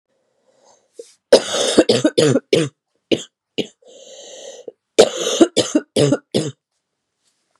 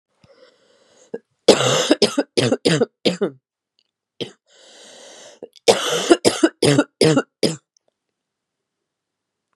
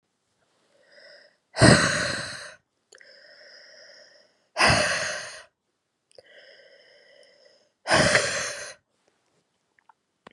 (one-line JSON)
{"three_cough_length": "7.6 s", "three_cough_amplitude": 32768, "three_cough_signal_mean_std_ratio": 0.38, "cough_length": "9.6 s", "cough_amplitude": 32768, "cough_signal_mean_std_ratio": 0.37, "exhalation_length": "10.3 s", "exhalation_amplitude": 28905, "exhalation_signal_mean_std_ratio": 0.33, "survey_phase": "beta (2021-08-13 to 2022-03-07)", "age": "18-44", "gender": "Female", "wearing_mask": "No", "symptom_sore_throat": true, "symptom_fatigue": true, "symptom_onset": "5 days", "smoker_status": "Never smoked", "respiratory_condition_asthma": false, "respiratory_condition_other": false, "recruitment_source": "Test and Trace", "submission_delay": "1 day", "covid_test_result": "Positive", "covid_test_method": "RT-qPCR", "covid_ct_value": 19.3, "covid_ct_gene": "ORF1ab gene", "covid_ct_mean": 19.7, "covid_viral_load": "350000 copies/ml", "covid_viral_load_category": "Low viral load (10K-1M copies/ml)"}